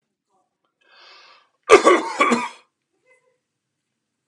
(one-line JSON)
{"cough_length": "4.3 s", "cough_amplitude": 32768, "cough_signal_mean_std_ratio": 0.27, "survey_phase": "beta (2021-08-13 to 2022-03-07)", "age": "45-64", "gender": "Male", "wearing_mask": "No", "symptom_cough_any": true, "smoker_status": "Current smoker (e-cigarettes or vapes only)", "respiratory_condition_asthma": false, "respiratory_condition_other": false, "recruitment_source": "REACT", "submission_delay": "1 day", "covid_test_result": "Negative", "covid_test_method": "RT-qPCR", "influenza_a_test_result": "Negative", "influenza_b_test_result": "Negative"}